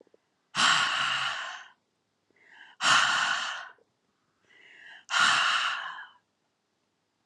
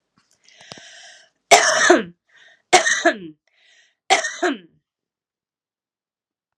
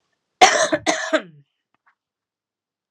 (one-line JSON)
{"exhalation_length": "7.3 s", "exhalation_amplitude": 11509, "exhalation_signal_mean_std_ratio": 0.49, "three_cough_length": "6.6 s", "three_cough_amplitude": 32768, "three_cough_signal_mean_std_ratio": 0.33, "cough_length": "2.9 s", "cough_amplitude": 32768, "cough_signal_mean_std_ratio": 0.32, "survey_phase": "alpha (2021-03-01 to 2021-08-12)", "age": "45-64", "gender": "Female", "wearing_mask": "No", "symptom_cough_any": true, "symptom_fatigue": true, "symptom_headache": true, "symptom_onset": "5 days", "smoker_status": "Never smoked", "respiratory_condition_asthma": false, "respiratory_condition_other": false, "recruitment_source": "Test and Trace", "submission_delay": "2 days", "covid_test_result": "Positive", "covid_test_method": "RT-qPCR", "covid_ct_value": 13.4, "covid_ct_gene": "N gene", "covid_ct_mean": 13.7, "covid_viral_load": "33000000 copies/ml", "covid_viral_load_category": "High viral load (>1M copies/ml)"}